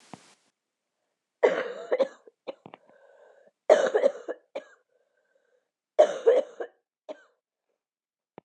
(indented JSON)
{
  "cough_length": "8.4 s",
  "cough_amplitude": 20199,
  "cough_signal_mean_std_ratio": 0.29,
  "survey_phase": "beta (2021-08-13 to 2022-03-07)",
  "age": "18-44",
  "gender": "Female",
  "wearing_mask": "No",
  "symptom_cough_any": true,
  "symptom_runny_or_blocked_nose": true,
  "symptom_shortness_of_breath": true,
  "symptom_sore_throat": true,
  "symptom_fatigue": true,
  "symptom_fever_high_temperature": true,
  "symptom_headache": true,
  "symptom_onset": "1 day",
  "smoker_status": "Ex-smoker",
  "respiratory_condition_asthma": false,
  "respiratory_condition_other": false,
  "recruitment_source": "Test and Trace",
  "submission_delay": "1 day",
  "covid_test_result": "Positive",
  "covid_test_method": "RT-qPCR",
  "covid_ct_value": 20.3,
  "covid_ct_gene": "N gene"
}